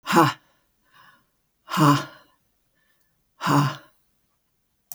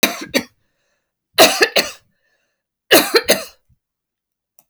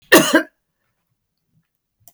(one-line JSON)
{"exhalation_length": "4.9 s", "exhalation_amplitude": 22074, "exhalation_signal_mean_std_ratio": 0.33, "three_cough_length": "4.7 s", "three_cough_amplitude": 32768, "three_cough_signal_mean_std_ratio": 0.33, "cough_length": "2.1 s", "cough_amplitude": 32768, "cough_signal_mean_std_ratio": 0.27, "survey_phase": "beta (2021-08-13 to 2022-03-07)", "age": "65+", "gender": "Female", "wearing_mask": "No", "symptom_cough_any": true, "symptom_diarrhoea": true, "smoker_status": "Ex-smoker", "respiratory_condition_asthma": false, "respiratory_condition_other": false, "recruitment_source": "REACT", "submission_delay": "1 day", "covid_test_result": "Negative", "covid_test_method": "RT-qPCR"}